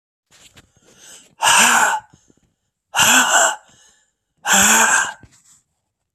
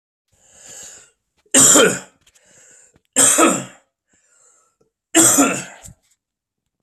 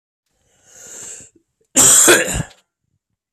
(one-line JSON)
{"exhalation_length": "6.1 s", "exhalation_amplitude": 32767, "exhalation_signal_mean_std_ratio": 0.47, "three_cough_length": "6.8 s", "three_cough_amplitude": 32768, "three_cough_signal_mean_std_ratio": 0.37, "cough_length": "3.3 s", "cough_amplitude": 32768, "cough_signal_mean_std_ratio": 0.37, "survey_phase": "alpha (2021-03-01 to 2021-08-12)", "age": "45-64", "gender": "Male", "wearing_mask": "No", "symptom_cough_any": true, "symptom_fatigue": true, "symptom_fever_high_temperature": true, "smoker_status": "Ex-smoker", "respiratory_condition_asthma": false, "respiratory_condition_other": false, "recruitment_source": "Test and Trace", "submission_delay": "2 days", "covid_test_result": "Positive", "covid_test_method": "RT-qPCR", "covid_ct_value": 18.8, "covid_ct_gene": "ORF1ab gene", "covid_ct_mean": 19.5, "covid_viral_load": "410000 copies/ml", "covid_viral_load_category": "Low viral load (10K-1M copies/ml)"}